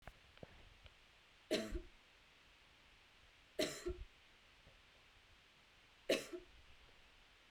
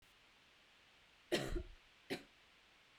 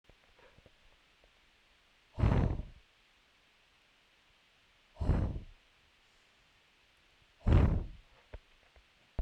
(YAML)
three_cough_length: 7.5 s
three_cough_amplitude: 2485
three_cough_signal_mean_std_ratio: 0.35
cough_length: 3.0 s
cough_amplitude: 1953
cough_signal_mean_std_ratio: 0.37
exhalation_length: 9.2 s
exhalation_amplitude: 5930
exhalation_signal_mean_std_ratio: 0.3
survey_phase: beta (2021-08-13 to 2022-03-07)
age: 45-64
gender: Female
wearing_mask: 'No'
symptom_none: true
smoker_status: Never smoked
respiratory_condition_asthma: false
respiratory_condition_other: false
recruitment_source: REACT
submission_delay: 1 day
covid_test_result: Negative
covid_test_method: RT-qPCR
influenza_a_test_result: Negative
influenza_b_test_result: Negative